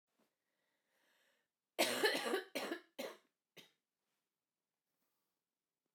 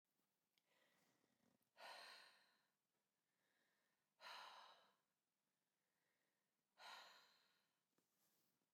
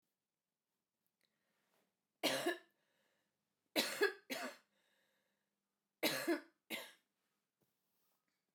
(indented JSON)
{
  "cough_length": "5.9 s",
  "cough_amplitude": 3187,
  "cough_signal_mean_std_ratio": 0.3,
  "exhalation_length": "8.7 s",
  "exhalation_amplitude": 147,
  "exhalation_signal_mean_std_ratio": 0.4,
  "three_cough_length": "8.5 s",
  "three_cough_amplitude": 2763,
  "three_cough_signal_mean_std_ratio": 0.3,
  "survey_phase": "beta (2021-08-13 to 2022-03-07)",
  "age": "18-44",
  "gender": "Female",
  "wearing_mask": "No",
  "symptom_cough_any": true,
  "symptom_runny_or_blocked_nose": true,
  "symptom_sore_throat": true,
  "symptom_fatigue": true,
  "symptom_headache": true,
  "symptom_other": true,
  "symptom_onset": "3 days",
  "smoker_status": "Never smoked",
  "respiratory_condition_asthma": false,
  "respiratory_condition_other": false,
  "recruitment_source": "Test and Trace",
  "submission_delay": "1 day",
  "covid_test_result": "Positive",
  "covid_test_method": "RT-qPCR",
  "covid_ct_value": 16.4,
  "covid_ct_gene": "ORF1ab gene"
}